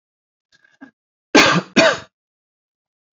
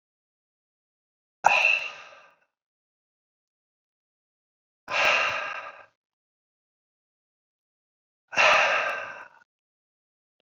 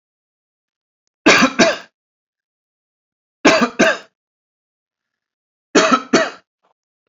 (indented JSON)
{
  "cough_length": "3.2 s",
  "cough_amplitude": 29280,
  "cough_signal_mean_std_ratio": 0.31,
  "exhalation_length": "10.4 s",
  "exhalation_amplitude": 26847,
  "exhalation_signal_mean_std_ratio": 0.32,
  "three_cough_length": "7.1 s",
  "three_cough_amplitude": 29891,
  "three_cough_signal_mean_std_ratio": 0.33,
  "survey_phase": "beta (2021-08-13 to 2022-03-07)",
  "age": "45-64",
  "gender": "Male",
  "wearing_mask": "No",
  "symptom_none": true,
  "symptom_onset": "4 days",
  "smoker_status": "Never smoked",
  "respiratory_condition_asthma": false,
  "respiratory_condition_other": true,
  "recruitment_source": "REACT",
  "submission_delay": "1 day",
  "covid_test_result": "Negative",
  "covid_test_method": "RT-qPCR"
}